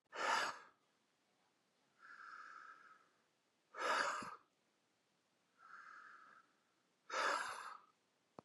{"exhalation_length": "8.4 s", "exhalation_amplitude": 1965, "exhalation_signal_mean_std_ratio": 0.4, "survey_phase": "beta (2021-08-13 to 2022-03-07)", "age": "45-64", "gender": "Male", "wearing_mask": "No", "symptom_none": true, "smoker_status": "Ex-smoker", "respiratory_condition_asthma": false, "respiratory_condition_other": false, "recruitment_source": "REACT", "submission_delay": "5 days", "covid_test_result": "Negative", "covid_test_method": "RT-qPCR", "influenza_a_test_result": "Negative", "influenza_b_test_result": "Negative"}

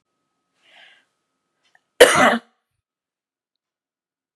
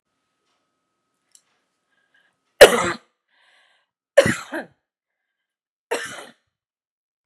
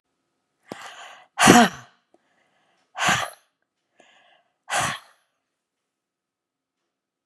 {"cough_length": "4.4 s", "cough_amplitude": 32768, "cough_signal_mean_std_ratio": 0.21, "three_cough_length": "7.3 s", "three_cough_amplitude": 32768, "three_cough_signal_mean_std_ratio": 0.18, "exhalation_length": "7.3 s", "exhalation_amplitude": 32768, "exhalation_signal_mean_std_ratio": 0.24, "survey_phase": "beta (2021-08-13 to 2022-03-07)", "age": "65+", "gender": "Female", "wearing_mask": "No", "symptom_none": true, "smoker_status": "Ex-smoker", "respiratory_condition_asthma": false, "respiratory_condition_other": false, "recruitment_source": "REACT", "submission_delay": "1 day", "covid_test_result": "Negative", "covid_test_method": "RT-qPCR", "influenza_a_test_result": "Negative", "influenza_b_test_result": "Negative"}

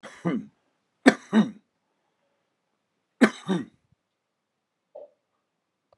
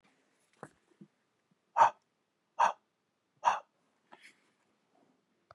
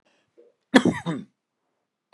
{"three_cough_length": "6.0 s", "three_cough_amplitude": 31702, "three_cough_signal_mean_std_ratio": 0.23, "exhalation_length": "5.5 s", "exhalation_amplitude": 8838, "exhalation_signal_mean_std_ratio": 0.2, "cough_length": "2.1 s", "cough_amplitude": 32767, "cough_signal_mean_std_ratio": 0.25, "survey_phase": "beta (2021-08-13 to 2022-03-07)", "age": "65+", "gender": "Male", "wearing_mask": "No", "symptom_none": true, "smoker_status": "Ex-smoker", "respiratory_condition_asthma": false, "respiratory_condition_other": false, "recruitment_source": "REACT", "submission_delay": "3 days", "covid_test_result": "Negative", "covid_test_method": "RT-qPCR", "influenza_a_test_result": "Negative", "influenza_b_test_result": "Negative"}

